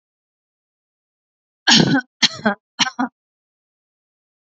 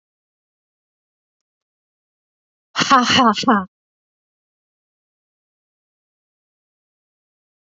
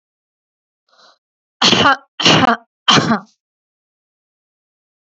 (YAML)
cough_length: 4.5 s
cough_amplitude: 31682
cough_signal_mean_std_ratio: 0.29
exhalation_length: 7.7 s
exhalation_amplitude: 27926
exhalation_signal_mean_std_ratio: 0.24
three_cough_length: 5.1 s
three_cough_amplitude: 32768
three_cough_signal_mean_std_ratio: 0.35
survey_phase: beta (2021-08-13 to 2022-03-07)
age: 45-64
gender: Female
wearing_mask: 'No'
symptom_none: true
smoker_status: Never smoked
respiratory_condition_asthma: false
respiratory_condition_other: false
recruitment_source: REACT
submission_delay: 1 day
covid_test_result: Negative
covid_test_method: RT-qPCR
influenza_a_test_result: Negative
influenza_b_test_result: Negative